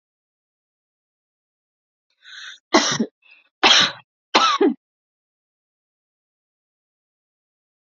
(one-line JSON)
{"three_cough_length": "7.9 s", "three_cough_amplitude": 32197, "three_cough_signal_mean_std_ratio": 0.27, "survey_phase": "alpha (2021-03-01 to 2021-08-12)", "age": "18-44", "gender": "Female", "wearing_mask": "No", "symptom_fatigue": true, "symptom_onset": "12 days", "smoker_status": "Never smoked", "respiratory_condition_asthma": false, "respiratory_condition_other": false, "recruitment_source": "REACT", "submission_delay": "1 day", "covid_test_result": "Negative", "covid_test_method": "RT-qPCR"}